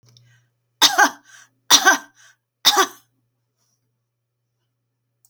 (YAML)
three_cough_length: 5.3 s
three_cough_amplitude: 32767
three_cough_signal_mean_std_ratio: 0.28
survey_phase: beta (2021-08-13 to 2022-03-07)
age: 65+
gender: Female
wearing_mask: 'No'
symptom_none: true
smoker_status: Never smoked
respiratory_condition_asthma: false
respiratory_condition_other: false
recruitment_source: REACT
submission_delay: 3 days
covid_test_result: Negative
covid_test_method: RT-qPCR